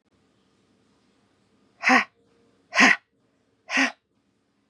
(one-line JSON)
{"exhalation_length": "4.7 s", "exhalation_amplitude": 24241, "exhalation_signal_mean_std_ratio": 0.27, "survey_phase": "beta (2021-08-13 to 2022-03-07)", "age": "18-44", "gender": "Female", "wearing_mask": "No", "symptom_cough_any": true, "symptom_runny_or_blocked_nose": true, "symptom_sore_throat": true, "symptom_fatigue": true, "symptom_fever_high_temperature": true, "symptom_change_to_sense_of_smell_or_taste": true, "symptom_loss_of_taste": true, "symptom_onset": "3 days", "smoker_status": "Never smoked", "respiratory_condition_asthma": false, "respiratory_condition_other": false, "recruitment_source": "Test and Trace", "submission_delay": "2 days", "covid_test_result": "Positive", "covid_test_method": "RT-qPCR", "covid_ct_value": 33.8, "covid_ct_gene": "N gene"}